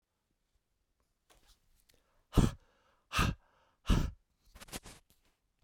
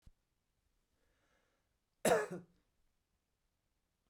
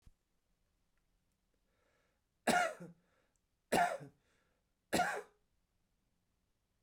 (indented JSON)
{
  "exhalation_length": "5.6 s",
  "exhalation_amplitude": 7831,
  "exhalation_signal_mean_std_ratio": 0.25,
  "cough_length": "4.1 s",
  "cough_amplitude": 4327,
  "cough_signal_mean_std_ratio": 0.2,
  "three_cough_length": "6.8 s",
  "three_cough_amplitude": 4743,
  "three_cough_signal_mean_std_ratio": 0.28,
  "survey_phase": "beta (2021-08-13 to 2022-03-07)",
  "age": "45-64",
  "gender": "Male",
  "wearing_mask": "No",
  "symptom_cough_any": true,
  "symptom_runny_or_blocked_nose": true,
  "symptom_fatigue": true,
  "symptom_change_to_sense_of_smell_or_taste": true,
  "smoker_status": "Never smoked",
  "respiratory_condition_asthma": false,
  "respiratory_condition_other": false,
  "recruitment_source": "Test and Trace",
  "submission_delay": "1 day",
  "covid_test_result": "Positive",
  "covid_test_method": "RT-qPCR",
  "covid_ct_value": 19.2,
  "covid_ct_gene": "N gene",
  "covid_ct_mean": 19.9,
  "covid_viral_load": "300000 copies/ml",
  "covid_viral_load_category": "Low viral load (10K-1M copies/ml)"
}